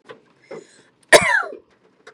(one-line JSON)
{"cough_length": "2.1 s", "cough_amplitude": 32768, "cough_signal_mean_std_ratio": 0.29, "survey_phase": "beta (2021-08-13 to 2022-03-07)", "age": "18-44", "gender": "Female", "wearing_mask": "No", "symptom_none": true, "smoker_status": "Never smoked", "respiratory_condition_asthma": false, "respiratory_condition_other": false, "recruitment_source": "REACT", "submission_delay": "1 day", "covid_test_result": "Negative", "covid_test_method": "RT-qPCR", "influenza_a_test_result": "Negative", "influenza_b_test_result": "Negative"}